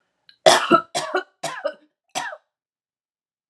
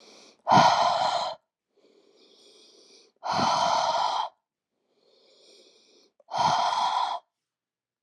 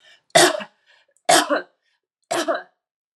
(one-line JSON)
{"cough_length": "3.5 s", "cough_amplitude": 31935, "cough_signal_mean_std_ratio": 0.32, "exhalation_length": "8.0 s", "exhalation_amplitude": 17266, "exhalation_signal_mean_std_ratio": 0.49, "three_cough_length": "3.2 s", "three_cough_amplitude": 30355, "three_cough_signal_mean_std_ratio": 0.37, "survey_phase": "alpha (2021-03-01 to 2021-08-12)", "age": "45-64", "gender": "Female", "wearing_mask": "No", "symptom_none": true, "smoker_status": "Never smoked", "respiratory_condition_asthma": false, "respiratory_condition_other": false, "recruitment_source": "REACT", "submission_delay": "1 day", "covid_test_result": "Negative", "covid_test_method": "RT-qPCR"}